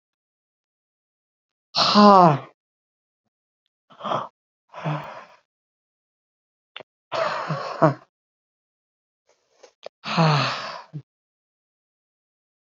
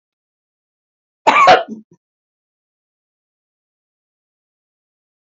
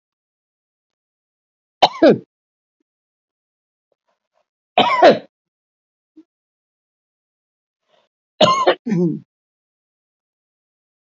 {"exhalation_length": "12.6 s", "exhalation_amplitude": 31984, "exhalation_signal_mean_std_ratio": 0.28, "cough_length": "5.2 s", "cough_amplitude": 28684, "cough_signal_mean_std_ratio": 0.22, "three_cough_length": "11.1 s", "three_cough_amplitude": 32768, "three_cough_signal_mean_std_ratio": 0.25, "survey_phase": "beta (2021-08-13 to 2022-03-07)", "age": "65+", "gender": "Female", "wearing_mask": "No", "symptom_none": true, "smoker_status": "Ex-smoker", "respiratory_condition_asthma": true, "respiratory_condition_other": true, "recruitment_source": "REACT", "submission_delay": "1 day", "covid_test_result": "Negative", "covid_test_method": "RT-qPCR"}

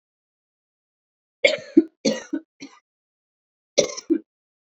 {"cough_length": "4.6 s", "cough_amplitude": 28331, "cough_signal_mean_std_ratio": 0.25, "survey_phase": "beta (2021-08-13 to 2022-03-07)", "age": "18-44", "gender": "Female", "wearing_mask": "No", "symptom_cough_any": true, "symptom_runny_or_blocked_nose": true, "symptom_shortness_of_breath": true, "symptom_fever_high_temperature": true, "symptom_headache": true, "smoker_status": "Ex-smoker", "respiratory_condition_asthma": false, "respiratory_condition_other": false, "recruitment_source": "Test and Trace", "submission_delay": "3 days", "covid_test_result": "Positive", "covid_test_method": "RT-qPCR", "covid_ct_value": 26.0, "covid_ct_gene": "ORF1ab gene"}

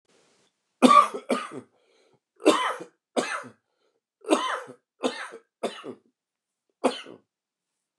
{"three_cough_length": "8.0 s", "three_cough_amplitude": 28481, "three_cough_signal_mean_std_ratio": 0.31, "survey_phase": "beta (2021-08-13 to 2022-03-07)", "age": "45-64", "gender": "Male", "wearing_mask": "No", "symptom_cough_any": true, "symptom_runny_or_blocked_nose": true, "symptom_shortness_of_breath": true, "symptom_diarrhoea": true, "symptom_fatigue": true, "symptom_headache": true, "symptom_change_to_sense_of_smell_or_taste": true, "symptom_loss_of_taste": true, "symptom_other": true, "symptom_onset": "5 days", "smoker_status": "Ex-smoker", "respiratory_condition_asthma": false, "respiratory_condition_other": false, "recruitment_source": "Test and Trace", "submission_delay": "1 day", "covid_test_result": "Positive", "covid_test_method": "RT-qPCR"}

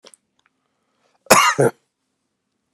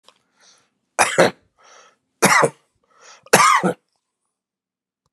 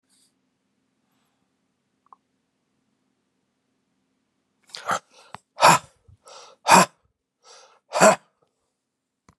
{"cough_length": "2.7 s", "cough_amplitude": 32768, "cough_signal_mean_std_ratio": 0.28, "three_cough_length": "5.1 s", "three_cough_amplitude": 32768, "three_cough_signal_mean_std_ratio": 0.33, "exhalation_length": "9.4 s", "exhalation_amplitude": 31768, "exhalation_signal_mean_std_ratio": 0.2, "survey_phase": "beta (2021-08-13 to 2022-03-07)", "age": "45-64", "gender": "Male", "wearing_mask": "No", "symptom_cough_any": true, "symptom_runny_or_blocked_nose": true, "symptom_headache": true, "symptom_onset": "3 days", "smoker_status": "Never smoked", "respiratory_condition_asthma": false, "respiratory_condition_other": false, "recruitment_source": "Test and Trace", "submission_delay": "2 days", "covid_test_result": "Positive", "covid_test_method": "RT-qPCR", "covid_ct_value": 14.8, "covid_ct_gene": "ORF1ab gene", "covid_ct_mean": 15.2, "covid_viral_load": "11000000 copies/ml", "covid_viral_load_category": "High viral load (>1M copies/ml)"}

